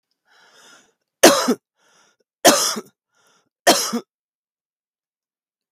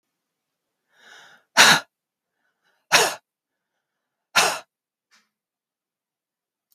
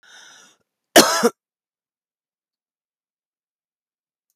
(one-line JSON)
{"three_cough_length": "5.7 s", "three_cough_amplitude": 32768, "three_cough_signal_mean_std_ratio": 0.28, "exhalation_length": "6.7 s", "exhalation_amplitude": 32768, "exhalation_signal_mean_std_ratio": 0.23, "cough_length": "4.4 s", "cough_amplitude": 32768, "cough_signal_mean_std_ratio": 0.19, "survey_phase": "beta (2021-08-13 to 2022-03-07)", "age": "45-64", "gender": "Female", "wearing_mask": "No", "symptom_cough_any": true, "symptom_new_continuous_cough": true, "symptom_runny_or_blocked_nose": true, "symptom_shortness_of_breath": true, "symptom_sore_throat": true, "symptom_fatigue": true, "symptom_fever_high_temperature": true, "symptom_headache": true, "symptom_onset": "3 days", "smoker_status": "Ex-smoker", "respiratory_condition_asthma": false, "respiratory_condition_other": false, "recruitment_source": "Test and Trace", "submission_delay": "1 day", "covid_test_result": "Positive", "covid_test_method": "RT-qPCR", "covid_ct_value": 17.8, "covid_ct_gene": "N gene"}